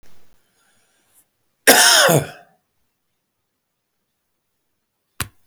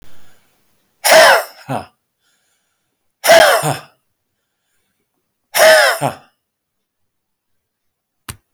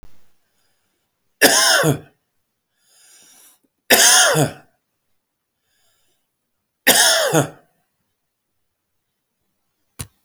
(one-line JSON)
{"cough_length": "5.5 s", "cough_amplitude": 32768, "cough_signal_mean_std_ratio": 0.27, "exhalation_length": "8.5 s", "exhalation_amplitude": 32768, "exhalation_signal_mean_std_ratio": 0.34, "three_cough_length": "10.2 s", "three_cough_amplitude": 32768, "three_cough_signal_mean_std_ratio": 0.34, "survey_phase": "beta (2021-08-13 to 2022-03-07)", "age": "65+", "gender": "Male", "wearing_mask": "No", "symptom_none": true, "smoker_status": "Ex-smoker", "respiratory_condition_asthma": false, "respiratory_condition_other": false, "recruitment_source": "REACT", "submission_delay": "2 days", "covid_test_result": "Negative", "covid_test_method": "RT-qPCR"}